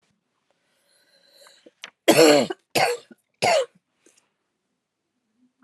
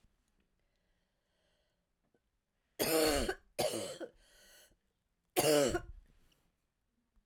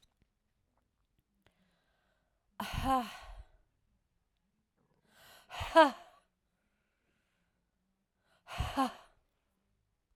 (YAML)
cough_length: 5.6 s
cough_amplitude: 26632
cough_signal_mean_std_ratio: 0.3
three_cough_length: 7.3 s
three_cough_amplitude: 5334
three_cough_signal_mean_std_ratio: 0.35
exhalation_length: 10.2 s
exhalation_amplitude: 9064
exhalation_signal_mean_std_ratio: 0.21
survey_phase: alpha (2021-03-01 to 2021-08-12)
age: 45-64
gender: Female
wearing_mask: 'No'
symptom_cough_any: true
symptom_new_continuous_cough: true
symptom_shortness_of_breath: true
symptom_abdominal_pain: true
symptom_fatigue: true
symptom_headache: true
symptom_change_to_sense_of_smell_or_taste: true
symptom_loss_of_taste: true
symptom_onset: 4 days
smoker_status: Never smoked
respiratory_condition_asthma: false
respiratory_condition_other: false
recruitment_source: Test and Trace
submission_delay: 1 day
covid_test_result: Positive
covid_test_method: RT-qPCR
covid_ct_value: 19.5
covid_ct_gene: ORF1ab gene
covid_ct_mean: 20.2
covid_viral_load: 240000 copies/ml
covid_viral_load_category: Low viral load (10K-1M copies/ml)